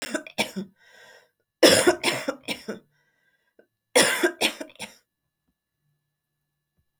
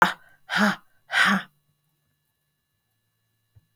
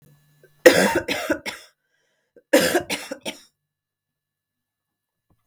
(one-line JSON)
{"three_cough_length": "7.0 s", "three_cough_amplitude": 25385, "three_cough_signal_mean_std_ratio": 0.32, "exhalation_length": "3.8 s", "exhalation_amplitude": 32768, "exhalation_signal_mean_std_ratio": 0.32, "cough_length": "5.5 s", "cough_amplitude": 32768, "cough_signal_mean_std_ratio": 0.3, "survey_phase": "beta (2021-08-13 to 2022-03-07)", "age": "45-64", "gender": "Female", "wearing_mask": "No", "symptom_cough_any": true, "symptom_runny_or_blocked_nose": true, "symptom_sore_throat": true, "symptom_fatigue": true, "symptom_onset": "2 days", "smoker_status": "Never smoked", "respiratory_condition_asthma": false, "respiratory_condition_other": false, "recruitment_source": "REACT", "submission_delay": "1 day", "covid_test_result": "Positive", "covid_test_method": "RT-qPCR", "covid_ct_value": 18.0, "covid_ct_gene": "E gene", "influenza_a_test_result": "Negative", "influenza_b_test_result": "Negative"}